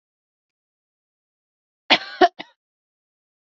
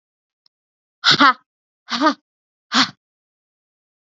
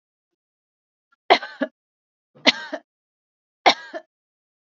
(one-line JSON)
{"cough_length": "3.4 s", "cough_amplitude": 29192, "cough_signal_mean_std_ratio": 0.17, "exhalation_length": "4.0 s", "exhalation_amplitude": 29839, "exhalation_signal_mean_std_ratio": 0.29, "three_cough_length": "4.6 s", "three_cough_amplitude": 32588, "three_cough_signal_mean_std_ratio": 0.2, "survey_phase": "beta (2021-08-13 to 2022-03-07)", "age": "18-44", "gender": "Female", "wearing_mask": "No", "symptom_runny_or_blocked_nose": true, "symptom_onset": "12 days", "smoker_status": "Never smoked", "respiratory_condition_asthma": false, "respiratory_condition_other": false, "recruitment_source": "REACT", "submission_delay": "0 days", "covid_test_result": "Negative", "covid_test_method": "RT-qPCR"}